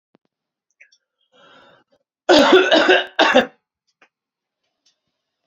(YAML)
cough_length: 5.5 s
cough_amplitude: 28783
cough_signal_mean_std_ratio: 0.34
survey_phase: beta (2021-08-13 to 2022-03-07)
age: 65+
gender: Male
wearing_mask: 'No'
symptom_none: true
smoker_status: Ex-smoker
respiratory_condition_asthma: false
respiratory_condition_other: false
recruitment_source: REACT
submission_delay: 2 days
covid_test_result: Negative
covid_test_method: RT-qPCR